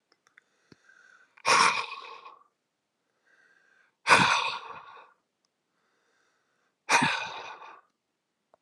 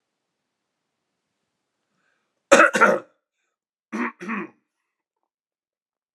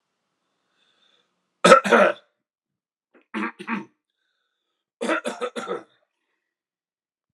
{
  "exhalation_length": "8.6 s",
  "exhalation_amplitude": 20484,
  "exhalation_signal_mean_std_ratio": 0.31,
  "cough_length": "6.1 s",
  "cough_amplitude": 32768,
  "cough_signal_mean_std_ratio": 0.23,
  "three_cough_length": "7.3 s",
  "three_cough_amplitude": 32768,
  "three_cough_signal_mean_std_ratio": 0.25,
  "survey_phase": "alpha (2021-03-01 to 2021-08-12)",
  "age": "45-64",
  "gender": "Male",
  "wearing_mask": "No",
  "symptom_cough_any": true,
  "symptom_change_to_sense_of_smell_or_taste": true,
  "symptom_loss_of_taste": true,
  "smoker_status": "Never smoked",
  "respiratory_condition_asthma": false,
  "respiratory_condition_other": false,
  "recruitment_source": "Test and Trace",
  "submission_delay": "2 days",
  "covid_test_result": "Positive",
  "covid_test_method": "RT-qPCR",
  "covid_ct_value": 27.5,
  "covid_ct_gene": "N gene"
}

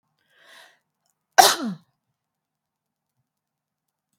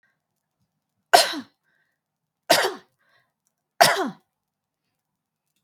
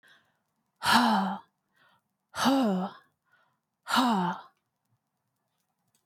{
  "cough_length": "4.2 s",
  "cough_amplitude": 32768,
  "cough_signal_mean_std_ratio": 0.17,
  "three_cough_length": "5.6 s",
  "three_cough_amplitude": 32768,
  "three_cough_signal_mean_std_ratio": 0.24,
  "exhalation_length": "6.1 s",
  "exhalation_amplitude": 11900,
  "exhalation_signal_mean_std_ratio": 0.42,
  "survey_phase": "beta (2021-08-13 to 2022-03-07)",
  "age": "18-44",
  "gender": "Female",
  "wearing_mask": "No",
  "symptom_none": true,
  "smoker_status": "Never smoked",
  "respiratory_condition_asthma": false,
  "respiratory_condition_other": false,
  "recruitment_source": "REACT",
  "submission_delay": "9 days",
  "covid_test_result": "Negative",
  "covid_test_method": "RT-qPCR",
  "influenza_a_test_result": "Negative",
  "influenza_b_test_result": "Negative"
}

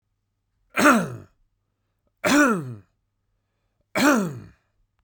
{
  "three_cough_length": "5.0 s",
  "three_cough_amplitude": 19520,
  "three_cough_signal_mean_std_ratio": 0.38,
  "survey_phase": "beta (2021-08-13 to 2022-03-07)",
  "age": "18-44",
  "gender": "Male",
  "wearing_mask": "No",
  "symptom_none": true,
  "symptom_onset": "9 days",
  "smoker_status": "Never smoked",
  "recruitment_source": "REACT",
  "submission_delay": "2 days",
  "covid_test_result": "Negative",
  "covid_test_method": "RT-qPCR",
  "influenza_a_test_result": "Negative",
  "influenza_b_test_result": "Negative"
}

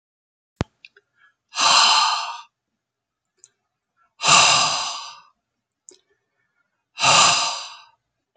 {
  "exhalation_length": "8.4 s",
  "exhalation_amplitude": 29065,
  "exhalation_signal_mean_std_ratio": 0.4,
  "survey_phase": "beta (2021-08-13 to 2022-03-07)",
  "age": "65+",
  "gender": "Male",
  "wearing_mask": "No",
  "symptom_none": true,
  "smoker_status": "Never smoked",
  "respiratory_condition_asthma": false,
  "respiratory_condition_other": false,
  "recruitment_source": "REACT",
  "submission_delay": "1 day",
  "covid_test_result": "Negative",
  "covid_test_method": "RT-qPCR"
}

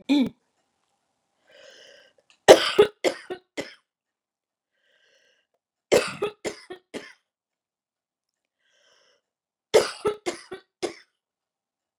{
  "three_cough_length": "12.0 s",
  "three_cough_amplitude": 32768,
  "three_cough_signal_mean_std_ratio": 0.22,
  "survey_phase": "beta (2021-08-13 to 2022-03-07)",
  "age": "45-64",
  "gender": "Female",
  "wearing_mask": "No",
  "symptom_none": true,
  "smoker_status": "Never smoked",
  "respiratory_condition_asthma": false,
  "respiratory_condition_other": false,
  "recruitment_source": "REACT",
  "submission_delay": "3 days",
  "covid_test_result": "Negative",
  "covid_test_method": "RT-qPCR",
  "influenza_a_test_result": "Negative",
  "influenza_b_test_result": "Negative"
}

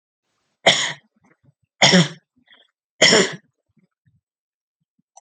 {
  "three_cough_length": "5.2 s",
  "three_cough_amplitude": 32326,
  "three_cough_signal_mean_std_ratio": 0.3,
  "survey_phase": "alpha (2021-03-01 to 2021-08-12)",
  "age": "45-64",
  "gender": "Female",
  "wearing_mask": "No",
  "symptom_abdominal_pain": true,
  "symptom_fatigue": true,
  "symptom_onset": "6 days",
  "smoker_status": "Never smoked",
  "respiratory_condition_asthma": false,
  "respiratory_condition_other": false,
  "recruitment_source": "REACT",
  "submission_delay": "1 day",
  "covid_test_result": "Negative",
  "covid_test_method": "RT-qPCR"
}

